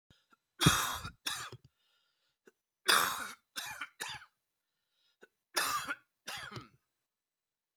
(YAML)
three_cough_length: 7.8 s
three_cough_amplitude: 10954
three_cough_signal_mean_std_ratio: 0.34
survey_phase: beta (2021-08-13 to 2022-03-07)
age: 45-64
gender: Male
wearing_mask: 'No'
symptom_cough_any: true
symptom_runny_or_blocked_nose: true
symptom_sore_throat: true
symptom_headache: true
symptom_onset: 6 days
smoker_status: Never smoked
respiratory_condition_asthma: false
respiratory_condition_other: false
recruitment_source: Test and Trace
submission_delay: 1 day
covid_test_result: Positive
covid_test_method: RT-qPCR
covid_ct_value: 14.6
covid_ct_gene: ORF1ab gene